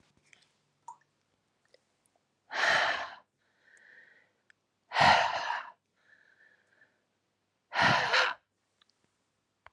{
  "exhalation_length": "9.7 s",
  "exhalation_amplitude": 10598,
  "exhalation_signal_mean_std_ratio": 0.33,
  "survey_phase": "alpha (2021-03-01 to 2021-08-12)",
  "age": "45-64",
  "gender": "Female",
  "wearing_mask": "No",
  "symptom_cough_any": true,
  "symptom_shortness_of_breath": true,
  "symptom_abdominal_pain": true,
  "symptom_diarrhoea": true,
  "symptom_fatigue": true,
  "symptom_fever_high_temperature": true,
  "symptom_headache": true,
  "symptom_change_to_sense_of_smell_or_taste": true,
  "symptom_loss_of_taste": true,
  "symptom_onset": "3 days",
  "smoker_status": "Current smoker (e-cigarettes or vapes only)",
  "respiratory_condition_asthma": false,
  "respiratory_condition_other": false,
  "recruitment_source": "Test and Trace",
  "submission_delay": "2 days",
  "covid_test_result": "Positive",
  "covid_test_method": "RT-qPCR",
  "covid_ct_value": 17.4,
  "covid_ct_gene": "ORF1ab gene",
  "covid_ct_mean": 17.6,
  "covid_viral_load": "1700000 copies/ml",
  "covid_viral_load_category": "High viral load (>1M copies/ml)"
}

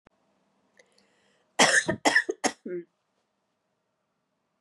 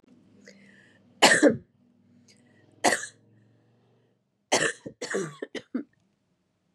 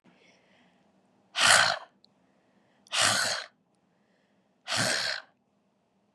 {
  "cough_length": "4.6 s",
  "cough_amplitude": 18882,
  "cough_signal_mean_std_ratio": 0.29,
  "three_cough_length": "6.7 s",
  "three_cough_amplitude": 22922,
  "three_cough_signal_mean_std_ratio": 0.29,
  "exhalation_length": "6.1 s",
  "exhalation_amplitude": 18683,
  "exhalation_signal_mean_std_ratio": 0.36,
  "survey_phase": "beta (2021-08-13 to 2022-03-07)",
  "age": "18-44",
  "gender": "Female",
  "wearing_mask": "No",
  "symptom_cough_any": true,
  "symptom_runny_or_blocked_nose": true,
  "symptom_sore_throat": true,
  "symptom_fatigue": true,
  "symptom_headache": true,
  "smoker_status": "Never smoked",
  "respiratory_condition_asthma": false,
  "respiratory_condition_other": false,
  "recruitment_source": "Test and Trace",
  "submission_delay": "1 day",
  "covid_test_result": "Positive",
  "covid_test_method": "RT-qPCR",
  "covid_ct_value": 18.6,
  "covid_ct_gene": "ORF1ab gene"
}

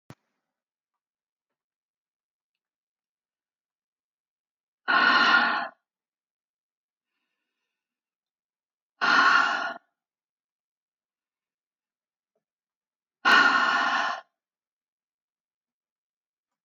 {
  "exhalation_length": "16.6 s",
  "exhalation_amplitude": 17343,
  "exhalation_signal_mean_std_ratio": 0.3,
  "survey_phase": "alpha (2021-03-01 to 2021-08-12)",
  "age": "65+",
  "gender": "Female",
  "wearing_mask": "No",
  "symptom_none": true,
  "smoker_status": "Ex-smoker",
  "respiratory_condition_asthma": false,
  "respiratory_condition_other": false,
  "recruitment_source": "REACT",
  "submission_delay": "2 days",
  "covid_test_result": "Negative",
  "covid_test_method": "RT-qPCR"
}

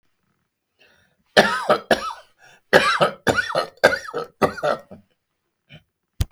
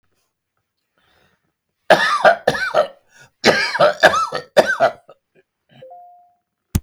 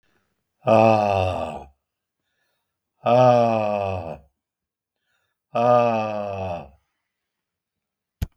{
  "three_cough_length": "6.3 s",
  "three_cough_amplitude": 32768,
  "three_cough_signal_mean_std_ratio": 0.38,
  "cough_length": "6.8 s",
  "cough_amplitude": 32768,
  "cough_signal_mean_std_ratio": 0.4,
  "exhalation_length": "8.4 s",
  "exhalation_amplitude": 23520,
  "exhalation_signal_mean_std_ratio": 0.43,
  "survey_phase": "beta (2021-08-13 to 2022-03-07)",
  "age": "65+",
  "gender": "Male",
  "wearing_mask": "No",
  "symptom_none": true,
  "smoker_status": "Never smoked",
  "respiratory_condition_asthma": false,
  "respiratory_condition_other": false,
  "recruitment_source": "REACT",
  "submission_delay": "2 days",
  "covid_test_result": "Negative",
  "covid_test_method": "RT-qPCR",
  "influenza_a_test_result": "Negative",
  "influenza_b_test_result": "Negative"
}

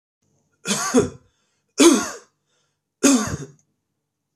{
  "three_cough_length": "4.4 s",
  "three_cough_amplitude": 27271,
  "three_cough_signal_mean_std_ratio": 0.36,
  "survey_phase": "beta (2021-08-13 to 2022-03-07)",
  "age": "45-64",
  "gender": "Male",
  "wearing_mask": "No",
  "symptom_none": true,
  "smoker_status": "Never smoked",
  "respiratory_condition_asthma": false,
  "respiratory_condition_other": false,
  "recruitment_source": "REACT",
  "submission_delay": "3 days",
  "covid_test_result": "Negative",
  "covid_test_method": "RT-qPCR",
  "influenza_a_test_result": "Unknown/Void",
  "influenza_b_test_result": "Unknown/Void"
}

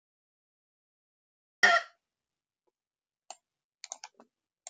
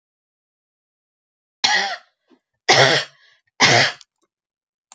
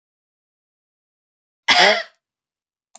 {
  "cough_length": "4.7 s",
  "cough_amplitude": 12544,
  "cough_signal_mean_std_ratio": 0.16,
  "three_cough_length": "4.9 s",
  "three_cough_amplitude": 32427,
  "three_cough_signal_mean_std_ratio": 0.34,
  "exhalation_length": "3.0 s",
  "exhalation_amplitude": 31200,
  "exhalation_signal_mean_std_ratio": 0.26,
  "survey_phase": "beta (2021-08-13 to 2022-03-07)",
  "age": "65+",
  "gender": "Female",
  "wearing_mask": "No",
  "symptom_diarrhoea": true,
  "symptom_fatigue": true,
  "symptom_change_to_sense_of_smell_or_taste": true,
  "symptom_loss_of_taste": true,
  "symptom_onset": "12 days",
  "smoker_status": "Ex-smoker",
  "respiratory_condition_asthma": false,
  "respiratory_condition_other": false,
  "recruitment_source": "REACT",
  "submission_delay": "1 day",
  "covid_test_result": "Negative",
  "covid_test_method": "RT-qPCR"
}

